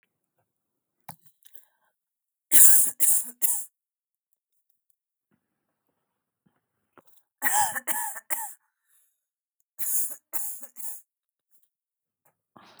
{"three_cough_length": "12.8 s", "three_cough_amplitude": 32768, "three_cough_signal_mean_std_ratio": 0.27, "survey_phase": "beta (2021-08-13 to 2022-03-07)", "age": "45-64", "gender": "Female", "wearing_mask": "No", "symptom_none": true, "smoker_status": "Never smoked", "respiratory_condition_asthma": false, "respiratory_condition_other": false, "recruitment_source": "REACT", "submission_delay": "1 day", "covid_test_result": "Negative", "covid_test_method": "RT-qPCR"}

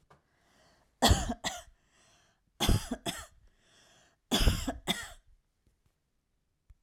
{"three_cough_length": "6.8 s", "three_cough_amplitude": 10174, "three_cough_signal_mean_std_ratio": 0.33, "survey_phase": "alpha (2021-03-01 to 2021-08-12)", "age": "45-64", "gender": "Female", "wearing_mask": "No", "symptom_shortness_of_breath": true, "symptom_abdominal_pain": true, "symptom_fatigue": true, "symptom_headache": true, "symptom_change_to_sense_of_smell_or_taste": true, "symptom_loss_of_taste": true, "symptom_onset": "3 days", "smoker_status": "Never smoked", "respiratory_condition_asthma": false, "respiratory_condition_other": false, "recruitment_source": "Test and Trace", "submission_delay": "2 days", "covid_test_result": "Positive", "covid_test_method": "RT-qPCR", "covid_ct_value": 38.4, "covid_ct_gene": "N gene"}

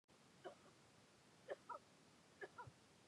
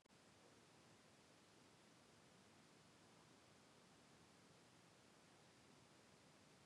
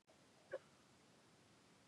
{"three_cough_length": "3.1 s", "three_cough_amplitude": 373, "three_cough_signal_mean_std_ratio": 0.54, "exhalation_length": "6.7 s", "exhalation_amplitude": 47, "exhalation_signal_mean_std_ratio": 1.22, "cough_length": "1.9 s", "cough_amplitude": 490, "cough_signal_mean_std_ratio": 0.43, "survey_phase": "beta (2021-08-13 to 2022-03-07)", "age": "45-64", "gender": "Female", "wearing_mask": "No", "symptom_cough_any": true, "symptom_runny_or_blocked_nose": true, "symptom_shortness_of_breath": true, "symptom_onset": "13 days", "smoker_status": "Never smoked", "respiratory_condition_asthma": false, "respiratory_condition_other": false, "recruitment_source": "REACT", "submission_delay": "2 days", "covid_test_result": "Negative", "covid_test_method": "RT-qPCR", "influenza_a_test_result": "Negative", "influenza_b_test_result": "Negative"}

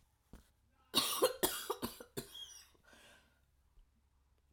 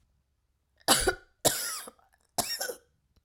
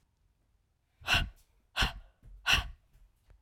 {"cough_length": "4.5 s", "cough_amplitude": 4535, "cough_signal_mean_std_ratio": 0.34, "three_cough_length": "3.2 s", "three_cough_amplitude": 13266, "three_cough_signal_mean_std_ratio": 0.37, "exhalation_length": "3.4 s", "exhalation_amplitude": 8691, "exhalation_signal_mean_std_ratio": 0.34, "survey_phase": "alpha (2021-03-01 to 2021-08-12)", "age": "45-64", "gender": "Female", "wearing_mask": "No", "symptom_none": true, "smoker_status": "Never smoked", "respiratory_condition_asthma": false, "respiratory_condition_other": false, "recruitment_source": "REACT", "submission_delay": "3 days", "covid_test_result": "Negative", "covid_test_method": "RT-qPCR"}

